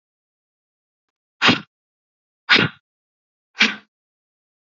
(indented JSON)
{
  "exhalation_length": "4.8 s",
  "exhalation_amplitude": 32767,
  "exhalation_signal_mean_std_ratio": 0.24,
  "survey_phase": "beta (2021-08-13 to 2022-03-07)",
  "age": "45-64",
  "gender": "Female",
  "wearing_mask": "No",
  "symptom_cough_any": true,
  "symptom_new_continuous_cough": true,
  "symptom_runny_or_blocked_nose": true,
  "symptom_fatigue": true,
  "symptom_onset": "4 days",
  "smoker_status": "Never smoked",
  "respiratory_condition_asthma": false,
  "respiratory_condition_other": false,
  "recruitment_source": "Test and Trace",
  "submission_delay": "2 days",
  "covid_test_result": "Positive",
  "covid_test_method": "RT-qPCR",
  "covid_ct_value": 13.5,
  "covid_ct_gene": "ORF1ab gene"
}